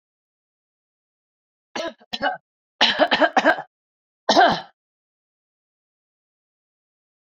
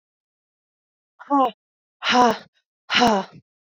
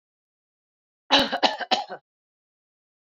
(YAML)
three_cough_length: 7.3 s
three_cough_amplitude: 26811
three_cough_signal_mean_std_ratio: 0.3
exhalation_length: 3.7 s
exhalation_amplitude: 24279
exhalation_signal_mean_std_ratio: 0.37
cough_length: 3.2 s
cough_amplitude: 23494
cough_signal_mean_std_ratio: 0.3
survey_phase: beta (2021-08-13 to 2022-03-07)
age: 45-64
gender: Female
wearing_mask: 'No'
symptom_none: true
smoker_status: Ex-smoker
respiratory_condition_asthma: false
respiratory_condition_other: false
recruitment_source: REACT
submission_delay: 2 days
covid_test_result: Negative
covid_test_method: RT-qPCR